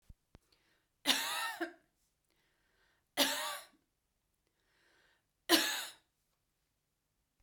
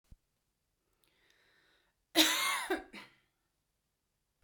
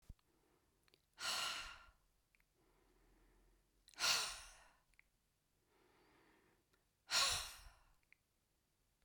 {"three_cough_length": "7.4 s", "three_cough_amplitude": 9395, "three_cough_signal_mean_std_ratio": 0.3, "cough_length": "4.4 s", "cough_amplitude": 9401, "cough_signal_mean_std_ratio": 0.28, "exhalation_length": "9.0 s", "exhalation_amplitude": 2252, "exhalation_signal_mean_std_ratio": 0.31, "survey_phase": "beta (2021-08-13 to 2022-03-07)", "age": "45-64", "gender": "Female", "wearing_mask": "No", "symptom_fatigue": true, "smoker_status": "Never smoked", "respiratory_condition_asthma": false, "respiratory_condition_other": false, "recruitment_source": "REACT", "submission_delay": "1 day", "covid_test_result": "Negative", "covid_test_method": "RT-qPCR"}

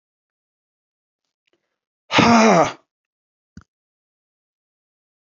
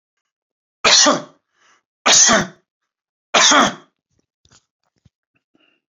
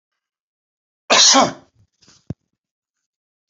{"exhalation_length": "5.2 s", "exhalation_amplitude": 27478, "exhalation_signal_mean_std_ratio": 0.26, "three_cough_length": "5.9 s", "three_cough_amplitude": 31971, "three_cough_signal_mean_std_ratio": 0.36, "cough_length": "3.5 s", "cough_amplitude": 30013, "cough_signal_mean_std_ratio": 0.28, "survey_phase": "beta (2021-08-13 to 2022-03-07)", "age": "65+", "gender": "Male", "wearing_mask": "No", "symptom_runny_or_blocked_nose": true, "smoker_status": "Ex-smoker", "respiratory_condition_asthma": false, "respiratory_condition_other": false, "recruitment_source": "REACT", "submission_delay": "1 day", "covid_test_result": "Negative", "covid_test_method": "RT-qPCR", "influenza_a_test_result": "Negative", "influenza_b_test_result": "Negative"}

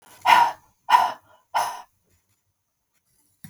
{"exhalation_length": "3.5 s", "exhalation_amplitude": 25839, "exhalation_signal_mean_std_ratio": 0.33, "survey_phase": "alpha (2021-03-01 to 2021-08-12)", "age": "45-64", "gender": "Female", "wearing_mask": "No", "symptom_none": true, "smoker_status": "Never smoked", "respiratory_condition_asthma": false, "respiratory_condition_other": false, "recruitment_source": "REACT", "submission_delay": "2 days", "covid_test_result": "Negative", "covid_test_method": "RT-qPCR"}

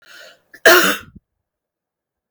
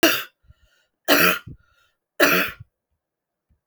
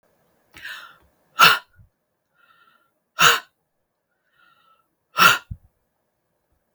{"cough_length": "2.3 s", "cough_amplitude": 32768, "cough_signal_mean_std_ratio": 0.29, "three_cough_length": "3.7 s", "three_cough_amplitude": 29158, "three_cough_signal_mean_std_ratio": 0.37, "exhalation_length": "6.7 s", "exhalation_amplitude": 32766, "exhalation_signal_mean_std_ratio": 0.24, "survey_phase": "beta (2021-08-13 to 2022-03-07)", "age": "45-64", "gender": "Female", "wearing_mask": "No", "symptom_none": true, "smoker_status": "Current smoker (1 to 10 cigarettes per day)", "respiratory_condition_asthma": false, "respiratory_condition_other": false, "recruitment_source": "REACT", "submission_delay": "1 day", "covid_test_result": "Negative", "covid_test_method": "RT-qPCR", "influenza_a_test_result": "Unknown/Void", "influenza_b_test_result": "Unknown/Void"}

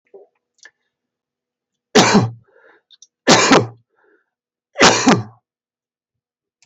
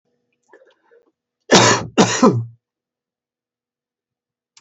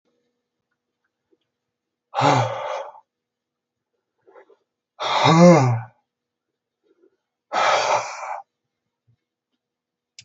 {"three_cough_length": "6.7 s", "three_cough_amplitude": 32768, "three_cough_signal_mean_std_ratio": 0.33, "cough_length": "4.6 s", "cough_amplitude": 32768, "cough_signal_mean_std_ratio": 0.31, "exhalation_length": "10.2 s", "exhalation_amplitude": 26769, "exhalation_signal_mean_std_ratio": 0.33, "survey_phase": "alpha (2021-03-01 to 2021-08-12)", "age": "65+", "gender": "Male", "wearing_mask": "No", "symptom_none": true, "smoker_status": "Ex-smoker", "respiratory_condition_asthma": false, "respiratory_condition_other": false, "recruitment_source": "REACT", "submission_delay": "7 days", "covid_test_result": "Negative", "covid_test_method": "RT-qPCR"}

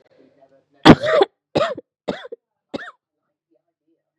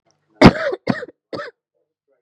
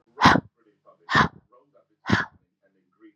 {"three_cough_length": "4.2 s", "three_cough_amplitude": 32768, "three_cough_signal_mean_std_ratio": 0.25, "cough_length": "2.2 s", "cough_amplitude": 32768, "cough_signal_mean_std_ratio": 0.27, "exhalation_length": "3.2 s", "exhalation_amplitude": 28153, "exhalation_signal_mean_std_ratio": 0.3, "survey_phase": "beta (2021-08-13 to 2022-03-07)", "age": "18-44", "gender": "Female", "wearing_mask": "No", "symptom_cough_any": true, "symptom_runny_or_blocked_nose": true, "symptom_shortness_of_breath": true, "symptom_sore_throat": true, "symptom_diarrhoea": true, "symptom_fatigue": true, "symptom_fever_high_temperature": true, "symptom_headache": true, "symptom_other": true, "symptom_onset": "3 days", "smoker_status": "Never smoked", "respiratory_condition_asthma": true, "respiratory_condition_other": false, "recruitment_source": "Test and Trace", "submission_delay": "0 days", "covid_test_result": "Positive", "covid_test_method": "RT-qPCR", "covid_ct_value": 24.1, "covid_ct_gene": "ORF1ab gene", "covid_ct_mean": 24.4, "covid_viral_load": "9700 copies/ml", "covid_viral_load_category": "Minimal viral load (< 10K copies/ml)"}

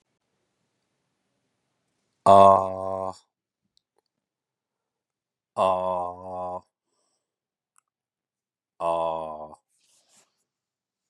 {"exhalation_length": "11.1 s", "exhalation_amplitude": 26833, "exhalation_signal_mean_std_ratio": 0.25, "survey_phase": "beta (2021-08-13 to 2022-03-07)", "age": "45-64", "gender": "Male", "wearing_mask": "No", "symptom_none": true, "smoker_status": "Never smoked", "respiratory_condition_asthma": false, "respiratory_condition_other": false, "recruitment_source": "REACT", "submission_delay": "1 day", "covid_test_result": "Negative", "covid_test_method": "RT-qPCR", "influenza_a_test_result": "Negative", "influenza_b_test_result": "Negative"}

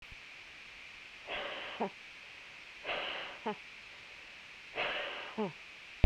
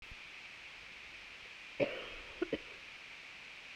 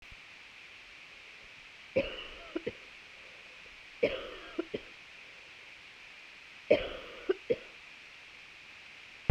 {"exhalation_length": "6.1 s", "exhalation_amplitude": 13298, "exhalation_signal_mean_std_ratio": 0.33, "cough_length": "3.8 s", "cough_amplitude": 3457, "cough_signal_mean_std_ratio": 0.6, "three_cough_length": "9.3 s", "three_cough_amplitude": 10107, "three_cough_signal_mean_std_ratio": 0.38, "survey_phase": "beta (2021-08-13 to 2022-03-07)", "age": "45-64", "gender": "Female", "wearing_mask": "No", "symptom_cough_any": true, "symptom_runny_or_blocked_nose": true, "symptom_sore_throat": true, "symptom_fatigue": true, "symptom_fever_high_temperature": true, "symptom_loss_of_taste": true, "symptom_onset": "3 days", "smoker_status": "Never smoked", "respiratory_condition_asthma": false, "respiratory_condition_other": false, "recruitment_source": "Test and Trace", "submission_delay": "2 days", "covid_test_result": "Positive", "covid_test_method": "RT-qPCR"}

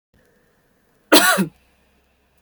{"cough_length": "2.4 s", "cough_amplitude": 32768, "cough_signal_mean_std_ratio": 0.29, "survey_phase": "beta (2021-08-13 to 2022-03-07)", "age": "18-44", "gender": "Female", "wearing_mask": "No", "symptom_none": true, "smoker_status": "Never smoked", "respiratory_condition_asthma": false, "respiratory_condition_other": false, "recruitment_source": "REACT", "submission_delay": "11 days", "covid_test_result": "Negative", "covid_test_method": "RT-qPCR"}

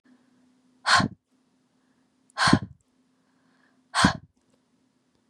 {"exhalation_length": "5.3 s", "exhalation_amplitude": 25632, "exhalation_signal_mean_std_ratio": 0.27, "survey_phase": "beta (2021-08-13 to 2022-03-07)", "age": "18-44", "gender": "Female", "wearing_mask": "No", "symptom_cough_any": true, "smoker_status": "Never smoked", "respiratory_condition_asthma": false, "respiratory_condition_other": false, "recruitment_source": "REACT", "submission_delay": "1 day", "covid_test_result": "Negative", "covid_test_method": "RT-qPCR", "influenza_a_test_result": "Negative", "influenza_b_test_result": "Negative"}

